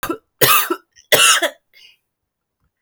{
  "three_cough_length": "2.8 s",
  "three_cough_amplitude": 32768,
  "three_cough_signal_mean_std_ratio": 0.41,
  "survey_phase": "beta (2021-08-13 to 2022-03-07)",
  "age": "18-44",
  "gender": "Female",
  "wearing_mask": "No",
  "symptom_cough_any": true,
  "symptom_runny_or_blocked_nose": true,
  "symptom_sore_throat": true,
  "symptom_fatigue": true,
  "symptom_fever_high_temperature": true,
  "symptom_headache": true,
  "symptom_change_to_sense_of_smell_or_taste": true,
  "smoker_status": "Never smoked",
  "respiratory_condition_asthma": false,
  "respiratory_condition_other": false,
  "recruitment_source": "Test and Trace",
  "submission_delay": "1 day",
  "covid_test_result": "Positive",
  "covid_test_method": "RT-qPCR",
  "covid_ct_value": 21.7,
  "covid_ct_gene": "ORF1ab gene"
}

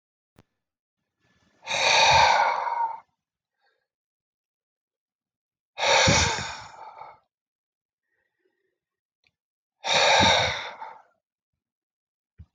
{
  "exhalation_length": "12.5 s",
  "exhalation_amplitude": 16066,
  "exhalation_signal_mean_std_ratio": 0.38,
  "survey_phase": "alpha (2021-03-01 to 2021-08-12)",
  "age": "45-64",
  "gender": "Male",
  "wearing_mask": "No",
  "symptom_none": true,
  "smoker_status": "Ex-smoker",
  "respiratory_condition_asthma": false,
  "respiratory_condition_other": false,
  "recruitment_source": "REACT",
  "submission_delay": "2 days",
  "covid_test_result": "Negative",
  "covid_test_method": "RT-qPCR"
}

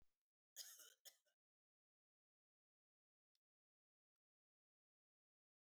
{
  "cough_length": "5.6 s",
  "cough_amplitude": 275,
  "cough_signal_mean_std_ratio": 0.2,
  "survey_phase": "beta (2021-08-13 to 2022-03-07)",
  "age": "45-64",
  "gender": "Female",
  "wearing_mask": "No",
  "symptom_none": true,
  "smoker_status": "Never smoked",
  "respiratory_condition_asthma": false,
  "respiratory_condition_other": false,
  "recruitment_source": "REACT",
  "submission_delay": "1 day",
  "covid_test_result": "Negative",
  "covid_test_method": "RT-qPCR",
  "influenza_a_test_result": "Negative",
  "influenza_b_test_result": "Negative"
}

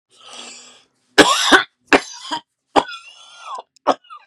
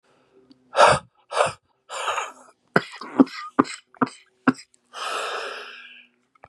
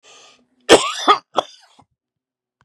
{
  "three_cough_length": "4.3 s",
  "three_cough_amplitude": 32768,
  "three_cough_signal_mean_std_ratio": 0.33,
  "exhalation_length": "6.5 s",
  "exhalation_amplitude": 32072,
  "exhalation_signal_mean_std_ratio": 0.34,
  "cough_length": "2.6 s",
  "cough_amplitude": 32768,
  "cough_signal_mean_std_ratio": 0.27,
  "survey_phase": "beta (2021-08-13 to 2022-03-07)",
  "age": "45-64",
  "gender": "Male",
  "wearing_mask": "No",
  "symptom_cough_any": true,
  "symptom_new_continuous_cough": true,
  "symptom_runny_or_blocked_nose": true,
  "symptom_sore_throat": true,
  "symptom_fatigue": true,
  "symptom_fever_high_temperature": true,
  "symptom_headache": true,
  "symptom_change_to_sense_of_smell_or_taste": true,
  "symptom_onset": "3 days",
  "smoker_status": "Ex-smoker",
  "respiratory_condition_asthma": true,
  "respiratory_condition_other": false,
  "recruitment_source": "Test and Trace",
  "submission_delay": "1 day",
  "covid_test_result": "Positive",
  "covid_test_method": "RT-qPCR",
  "covid_ct_value": 27.1,
  "covid_ct_gene": "ORF1ab gene"
}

